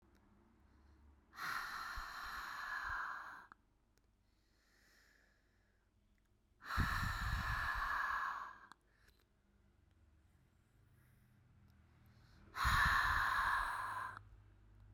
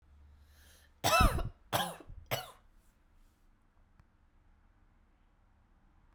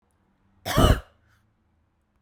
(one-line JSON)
{"exhalation_length": "14.9 s", "exhalation_amplitude": 2396, "exhalation_signal_mean_std_ratio": 0.5, "three_cough_length": "6.1 s", "three_cough_amplitude": 6775, "three_cough_signal_mean_std_ratio": 0.29, "cough_length": "2.2 s", "cough_amplitude": 20399, "cough_signal_mean_std_ratio": 0.27, "survey_phase": "beta (2021-08-13 to 2022-03-07)", "age": "18-44", "gender": "Female", "wearing_mask": "No", "symptom_runny_or_blocked_nose": true, "symptom_fatigue": true, "symptom_headache": true, "symptom_change_to_sense_of_smell_or_taste": true, "symptom_other": true, "smoker_status": "Never smoked", "respiratory_condition_asthma": false, "respiratory_condition_other": false, "recruitment_source": "Test and Trace", "submission_delay": "3 days", "covid_test_result": "Positive", "covid_test_method": "RT-qPCR"}